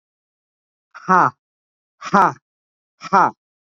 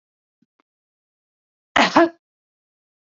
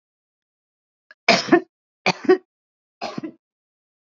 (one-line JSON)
{"exhalation_length": "3.8 s", "exhalation_amplitude": 28118, "exhalation_signal_mean_std_ratio": 0.3, "cough_length": "3.1 s", "cough_amplitude": 30259, "cough_signal_mean_std_ratio": 0.22, "three_cough_length": "4.1 s", "three_cough_amplitude": 31011, "three_cough_signal_mean_std_ratio": 0.26, "survey_phase": "beta (2021-08-13 to 2022-03-07)", "age": "45-64", "gender": "Female", "wearing_mask": "No", "symptom_none": true, "smoker_status": "Current smoker (11 or more cigarettes per day)", "respiratory_condition_asthma": false, "respiratory_condition_other": false, "recruitment_source": "REACT", "submission_delay": "3 days", "covid_test_result": "Negative", "covid_test_method": "RT-qPCR", "influenza_a_test_result": "Negative", "influenza_b_test_result": "Negative"}